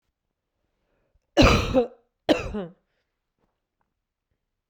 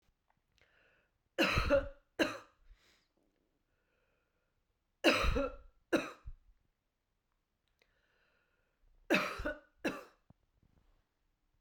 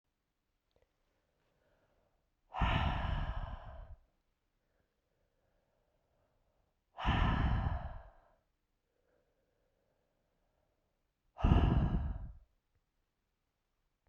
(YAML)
cough_length: 4.7 s
cough_amplitude: 21868
cough_signal_mean_std_ratio: 0.29
three_cough_length: 11.6 s
three_cough_amplitude: 6363
three_cough_signal_mean_std_ratio: 0.3
exhalation_length: 14.1 s
exhalation_amplitude: 7589
exhalation_signal_mean_std_ratio: 0.35
survey_phase: beta (2021-08-13 to 2022-03-07)
age: 45-64
gender: Female
wearing_mask: 'No'
symptom_runny_or_blocked_nose: true
symptom_shortness_of_breath: true
symptom_fatigue: true
symptom_change_to_sense_of_smell_or_taste: true
symptom_onset: 7 days
smoker_status: Ex-smoker
respiratory_condition_asthma: false
respiratory_condition_other: false
recruitment_source: Test and Trace
submission_delay: 6 days
covid_test_result: Positive
covid_test_method: RT-qPCR
covid_ct_value: 24.8
covid_ct_gene: N gene